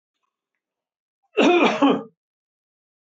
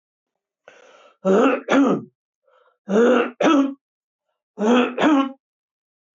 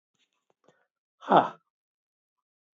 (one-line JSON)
{"cough_length": "3.1 s", "cough_amplitude": 20531, "cough_signal_mean_std_ratio": 0.37, "three_cough_length": "6.1 s", "three_cough_amplitude": 22160, "three_cough_signal_mean_std_ratio": 0.5, "exhalation_length": "2.7 s", "exhalation_amplitude": 19110, "exhalation_signal_mean_std_ratio": 0.18, "survey_phase": "beta (2021-08-13 to 2022-03-07)", "age": "45-64", "gender": "Male", "wearing_mask": "No", "symptom_none": true, "smoker_status": "Never smoked", "respiratory_condition_asthma": false, "respiratory_condition_other": false, "recruitment_source": "REACT", "submission_delay": "1 day", "covid_test_result": "Negative", "covid_test_method": "RT-qPCR", "influenza_a_test_result": "Unknown/Void", "influenza_b_test_result": "Unknown/Void"}